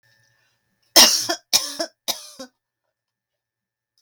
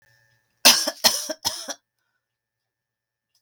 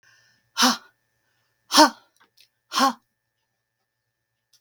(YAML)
three_cough_length: 4.0 s
three_cough_amplitude: 32767
three_cough_signal_mean_std_ratio: 0.27
cough_length: 3.4 s
cough_amplitude: 32768
cough_signal_mean_std_ratio: 0.27
exhalation_length: 4.6 s
exhalation_amplitude: 32768
exhalation_signal_mean_std_ratio: 0.25
survey_phase: beta (2021-08-13 to 2022-03-07)
age: 65+
gender: Female
wearing_mask: 'No'
symptom_runny_or_blocked_nose: true
symptom_shortness_of_breath: true
symptom_abdominal_pain: true
symptom_headache: true
smoker_status: Ex-smoker
respiratory_condition_asthma: false
respiratory_condition_other: false
recruitment_source: REACT
submission_delay: 1 day
covid_test_result: Negative
covid_test_method: RT-qPCR
covid_ct_value: 38.0
covid_ct_gene: N gene
influenza_a_test_result: Negative
influenza_b_test_result: Negative